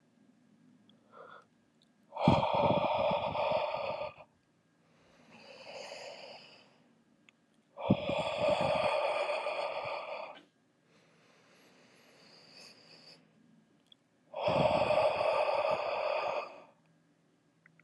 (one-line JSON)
{"exhalation_length": "17.8 s", "exhalation_amplitude": 9394, "exhalation_signal_mean_std_ratio": 0.52, "survey_phase": "alpha (2021-03-01 to 2021-08-12)", "age": "18-44", "gender": "Male", "wearing_mask": "No", "symptom_cough_any": true, "symptom_new_continuous_cough": true, "symptom_fever_high_temperature": true, "symptom_headache": true, "symptom_change_to_sense_of_smell_or_taste": true, "symptom_loss_of_taste": true, "smoker_status": "Never smoked", "respiratory_condition_asthma": false, "respiratory_condition_other": false, "recruitment_source": "Test and Trace", "submission_delay": "1 day", "covid_test_result": "Positive", "covid_test_method": "RT-qPCR"}